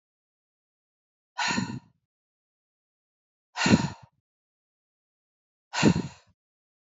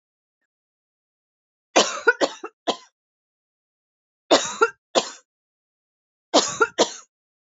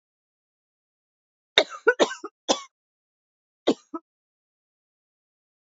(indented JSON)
{
  "exhalation_length": "6.8 s",
  "exhalation_amplitude": 17333,
  "exhalation_signal_mean_std_ratio": 0.26,
  "three_cough_length": "7.4 s",
  "three_cough_amplitude": 25215,
  "three_cough_signal_mean_std_ratio": 0.28,
  "cough_length": "5.6 s",
  "cough_amplitude": 32767,
  "cough_signal_mean_std_ratio": 0.19,
  "survey_phase": "alpha (2021-03-01 to 2021-08-12)",
  "age": "45-64",
  "gender": "Female",
  "wearing_mask": "No",
  "symptom_cough_any": true,
  "symptom_fatigue": true,
  "smoker_status": "Never smoked",
  "respiratory_condition_asthma": false,
  "respiratory_condition_other": false,
  "recruitment_source": "Test and Trace",
  "submission_delay": "2 days",
  "covid_test_result": "Positive",
  "covid_test_method": "RT-qPCR",
  "covid_ct_value": 17.8,
  "covid_ct_gene": "ORF1ab gene"
}